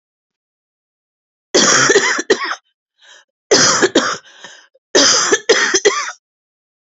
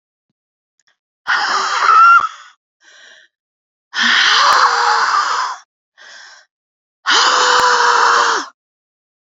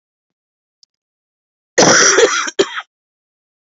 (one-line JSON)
{"three_cough_length": "6.9 s", "three_cough_amplitude": 32768, "three_cough_signal_mean_std_ratio": 0.49, "exhalation_length": "9.4 s", "exhalation_amplitude": 32701, "exhalation_signal_mean_std_ratio": 0.58, "cough_length": "3.8 s", "cough_amplitude": 32768, "cough_signal_mean_std_ratio": 0.38, "survey_phase": "beta (2021-08-13 to 2022-03-07)", "age": "45-64", "gender": "Female", "wearing_mask": "No", "symptom_cough_any": true, "symptom_runny_or_blocked_nose": true, "symptom_shortness_of_breath": true, "symptom_fatigue": true, "symptom_headache": true, "symptom_other": true, "smoker_status": "Current smoker (1 to 10 cigarettes per day)", "respiratory_condition_asthma": false, "respiratory_condition_other": false, "recruitment_source": "Test and Trace", "submission_delay": "2 days", "covid_test_result": "Positive", "covid_test_method": "RT-qPCR", "covid_ct_value": 27.9, "covid_ct_gene": "N gene", "covid_ct_mean": 28.3, "covid_viral_load": "530 copies/ml", "covid_viral_load_category": "Minimal viral load (< 10K copies/ml)"}